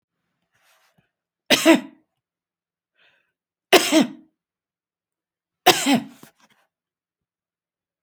{"three_cough_length": "8.0 s", "three_cough_amplitude": 31055, "three_cough_signal_mean_std_ratio": 0.25, "survey_phase": "beta (2021-08-13 to 2022-03-07)", "age": "65+", "gender": "Female", "wearing_mask": "No", "symptom_none": true, "smoker_status": "Never smoked", "respiratory_condition_asthma": false, "respiratory_condition_other": false, "recruitment_source": "REACT", "submission_delay": "1 day", "covid_test_result": "Negative", "covid_test_method": "RT-qPCR"}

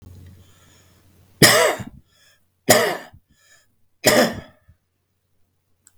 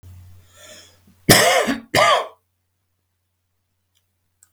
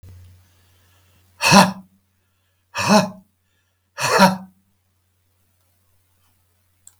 {"three_cough_length": "6.0 s", "three_cough_amplitude": 32768, "three_cough_signal_mean_std_ratio": 0.32, "cough_length": "4.5 s", "cough_amplitude": 32768, "cough_signal_mean_std_ratio": 0.34, "exhalation_length": "7.0 s", "exhalation_amplitude": 32766, "exhalation_signal_mean_std_ratio": 0.28, "survey_phase": "beta (2021-08-13 to 2022-03-07)", "age": "65+", "gender": "Male", "wearing_mask": "No", "symptom_cough_any": true, "symptom_onset": "12 days", "smoker_status": "Ex-smoker", "respiratory_condition_asthma": false, "respiratory_condition_other": false, "recruitment_source": "REACT", "submission_delay": "2 days", "covid_test_result": "Negative", "covid_test_method": "RT-qPCR", "influenza_a_test_result": "Negative", "influenza_b_test_result": "Negative"}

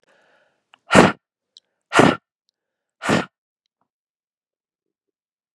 {"exhalation_length": "5.5 s", "exhalation_amplitude": 32768, "exhalation_signal_mean_std_ratio": 0.23, "survey_phase": "beta (2021-08-13 to 2022-03-07)", "age": "18-44", "gender": "Female", "wearing_mask": "No", "symptom_cough_any": true, "symptom_fatigue": true, "symptom_onset": "12 days", "smoker_status": "Never smoked", "respiratory_condition_asthma": false, "respiratory_condition_other": false, "recruitment_source": "REACT", "submission_delay": "3 days", "covid_test_result": "Negative", "covid_test_method": "RT-qPCR", "influenza_a_test_result": "Negative", "influenza_b_test_result": "Negative"}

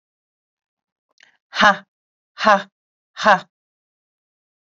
{"exhalation_length": "4.6 s", "exhalation_amplitude": 28228, "exhalation_signal_mean_std_ratio": 0.25, "survey_phase": "beta (2021-08-13 to 2022-03-07)", "age": "45-64", "gender": "Female", "wearing_mask": "No", "symptom_none": true, "smoker_status": "Ex-smoker", "respiratory_condition_asthma": false, "respiratory_condition_other": false, "recruitment_source": "REACT", "submission_delay": "2 days", "covid_test_result": "Negative", "covid_test_method": "RT-qPCR"}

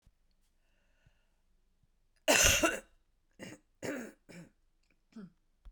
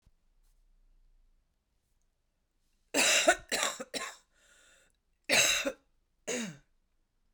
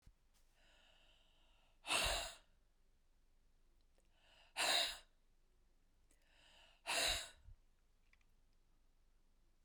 {"cough_length": "5.7 s", "cough_amplitude": 12141, "cough_signal_mean_std_ratio": 0.28, "three_cough_length": "7.3 s", "three_cough_amplitude": 10157, "three_cough_signal_mean_std_ratio": 0.34, "exhalation_length": "9.6 s", "exhalation_amplitude": 1964, "exhalation_signal_mean_std_ratio": 0.33, "survey_phase": "beta (2021-08-13 to 2022-03-07)", "age": "45-64", "gender": "Female", "wearing_mask": "No", "symptom_cough_any": true, "symptom_runny_or_blocked_nose": true, "symptom_fever_high_temperature": true, "symptom_headache": true, "symptom_change_to_sense_of_smell_or_taste": true, "symptom_loss_of_taste": true, "symptom_onset": "3 days", "smoker_status": "Never smoked", "respiratory_condition_asthma": false, "respiratory_condition_other": false, "recruitment_source": "Test and Trace", "submission_delay": "2 days", "covid_test_result": "Positive", "covid_test_method": "RT-qPCR"}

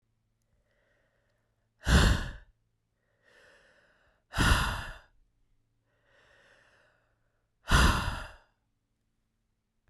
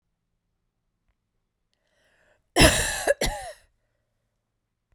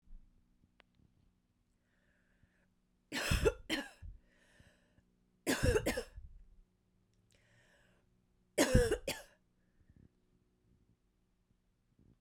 {"exhalation_length": "9.9 s", "exhalation_amplitude": 10229, "exhalation_signal_mean_std_ratio": 0.29, "cough_length": "4.9 s", "cough_amplitude": 29381, "cough_signal_mean_std_ratio": 0.26, "three_cough_length": "12.2 s", "three_cough_amplitude": 7093, "three_cough_signal_mean_std_ratio": 0.28, "survey_phase": "beta (2021-08-13 to 2022-03-07)", "age": "18-44", "gender": "Female", "wearing_mask": "No", "symptom_runny_or_blocked_nose": true, "symptom_sore_throat": true, "symptom_fatigue": true, "symptom_headache": true, "symptom_change_to_sense_of_smell_or_taste": true, "smoker_status": "Never smoked", "respiratory_condition_asthma": false, "respiratory_condition_other": false, "recruitment_source": "Test and Trace", "submission_delay": "1 day", "covid_test_result": "Positive", "covid_test_method": "RT-qPCR", "covid_ct_value": 18.6, "covid_ct_gene": "ORF1ab gene"}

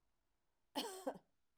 {"cough_length": "1.6 s", "cough_amplitude": 1233, "cough_signal_mean_std_ratio": 0.36, "survey_phase": "alpha (2021-03-01 to 2021-08-12)", "age": "65+", "gender": "Female", "wearing_mask": "No", "symptom_none": true, "smoker_status": "Never smoked", "respiratory_condition_asthma": false, "respiratory_condition_other": false, "recruitment_source": "REACT", "submission_delay": "2 days", "covid_test_result": "Negative", "covid_test_method": "RT-qPCR"}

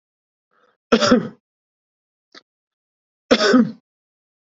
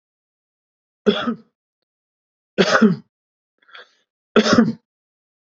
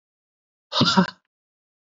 {"cough_length": "4.5 s", "cough_amplitude": 31052, "cough_signal_mean_std_ratio": 0.3, "three_cough_length": "5.5 s", "three_cough_amplitude": 28991, "three_cough_signal_mean_std_ratio": 0.31, "exhalation_length": "1.9 s", "exhalation_amplitude": 24695, "exhalation_signal_mean_std_ratio": 0.32, "survey_phase": "beta (2021-08-13 to 2022-03-07)", "age": "18-44", "gender": "Male", "wearing_mask": "No", "symptom_none": true, "symptom_onset": "8 days", "smoker_status": "Never smoked", "respiratory_condition_asthma": false, "respiratory_condition_other": false, "recruitment_source": "REACT", "submission_delay": "2 days", "covid_test_result": "Negative", "covid_test_method": "RT-qPCR", "influenza_a_test_result": "Negative", "influenza_b_test_result": "Negative"}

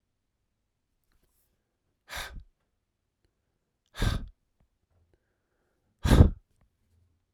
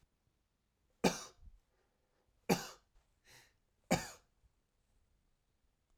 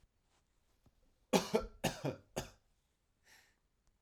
{"exhalation_length": "7.3 s", "exhalation_amplitude": 21471, "exhalation_signal_mean_std_ratio": 0.19, "three_cough_length": "6.0 s", "three_cough_amplitude": 6312, "three_cough_signal_mean_std_ratio": 0.21, "cough_length": "4.0 s", "cough_amplitude": 6294, "cough_signal_mean_std_ratio": 0.28, "survey_phase": "beta (2021-08-13 to 2022-03-07)", "age": "45-64", "gender": "Male", "wearing_mask": "No", "symptom_runny_or_blocked_nose": true, "symptom_fatigue": true, "symptom_loss_of_taste": true, "symptom_onset": "0 days", "smoker_status": "Ex-smoker", "respiratory_condition_asthma": false, "respiratory_condition_other": false, "recruitment_source": "Test and Trace", "submission_delay": "0 days", "covid_test_result": "Positive", "covid_test_method": "RT-qPCR", "covid_ct_value": 15.3, "covid_ct_gene": "N gene", "covid_ct_mean": 16.0, "covid_viral_load": "5900000 copies/ml", "covid_viral_load_category": "High viral load (>1M copies/ml)"}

